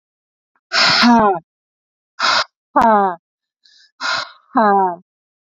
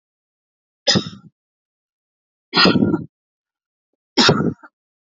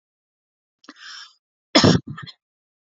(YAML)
exhalation_length: 5.5 s
exhalation_amplitude: 30122
exhalation_signal_mean_std_ratio: 0.49
three_cough_length: 5.1 s
three_cough_amplitude: 32767
three_cough_signal_mean_std_ratio: 0.34
cough_length: 3.0 s
cough_amplitude: 29370
cough_signal_mean_std_ratio: 0.25
survey_phase: beta (2021-08-13 to 2022-03-07)
age: 18-44
gender: Female
wearing_mask: 'No'
symptom_none: true
smoker_status: Never smoked
respiratory_condition_asthma: false
respiratory_condition_other: false
recruitment_source: REACT
submission_delay: 1 day
covid_test_result: Negative
covid_test_method: RT-qPCR